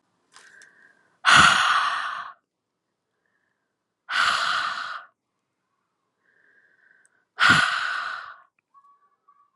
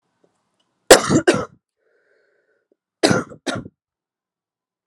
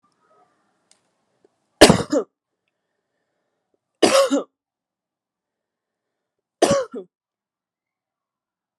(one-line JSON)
{"exhalation_length": "9.6 s", "exhalation_amplitude": 27011, "exhalation_signal_mean_std_ratio": 0.37, "cough_length": "4.9 s", "cough_amplitude": 32768, "cough_signal_mean_std_ratio": 0.25, "three_cough_length": "8.8 s", "three_cough_amplitude": 32768, "three_cough_signal_mean_std_ratio": 0.23, "survey_phase": "alpha (2021-03-01 to 2021-08-12)", "age": "18-44", "gender": "Female", "wearing_mask": "No", "symptom_cough_any": true, "symptom_new_continuous_cough": true, "symptom_fatigue": true, "symptom_fever_high_temperature": true, "symptom_headache": true, "symptom_change_to_sense_of_smell_or_taste": true, "symptom_onset": "3 days", "smoker_status": "Never smoked", "respiratory_condition_asthma": false, "respiratory_condition_other": false, "recruitment_source": "Test and Trace", "submission_delay": "1 day", "covid_test_result": "Positive", "covid_test_method": "RT-qPCR", "covid_ct_value": 12.0, "covid_ct_gene": "ORF1ab gene", "covid_ct_mean": 12.3, "covid_viral_load": "95000000 copies/ml", "covid_viral_load_category": "High viral load (>1M copies/ml)"}